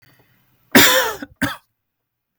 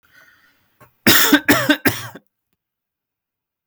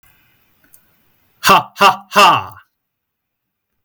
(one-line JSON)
{"cough_length": "2.4 s", "cough_amplitude": 32768, "cough_signal_mean_std_ratio": 0.34, "three_cough_length": "3.7 s", "three_cough_amplitude": 32768, "three_cough_signal_mean_std_ratio": 0.35, "exhalation_length": "3.8 s", "exhalation_amplitude": 32768, "exhalation_signal_mean_std_ratio": 0.33, "survey_phase": "beta (2021-08-13 to 2022-03-07)", "age": "45-64", "gender": "Male", "wearing_mask": "No", "symptom_none": true, "smoker_status": "Ex-smoker", "respiratory_condition_asthma": false, "respiratory_condition_other": false, "recruitment_source": "REACT", "submission_delay": "0 days", "covid_test_result": "Negative", "covid_test_method": "RT-qPCR", "influenza_a_test_result": "Negative", "influenza_b_test_result": "Negative"}